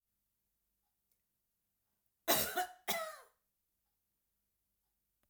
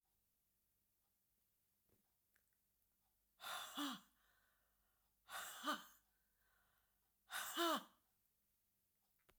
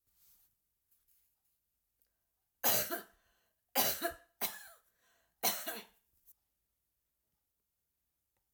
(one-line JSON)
{"cough_length": "5.3 s", "cough_amplitude": 4284, "cough_signal_mean_std_ratio": 0.26, "exhalation_length": "9.4 s", "exhalation_amplitude": 1090, "exhalation_signal_mean_std_ratio": 0.31, "three_cough_length": "8.5 s", "three_cough_amplitude": 4926, "three_cough_signal_mean_std_ratio": 0.28, "survey_phase": "beta (2021-08-13 to 2022-03-07)", "age": "65+", "gender": "Female", "wearing_mask": "No", "symptom_none": true, "smoker_status": "Ex-smoker", "respiratory_condition_asthma": false, "respiratory_condition_other": false, "recruitment_source": "REACT", "submission_delay": "3 days", "covid_test_result": "Negative", "covid_test_method": "RT-qPCR", "influenza_a_test_result": "Negative", "influenza_b_test_result": "Negative"}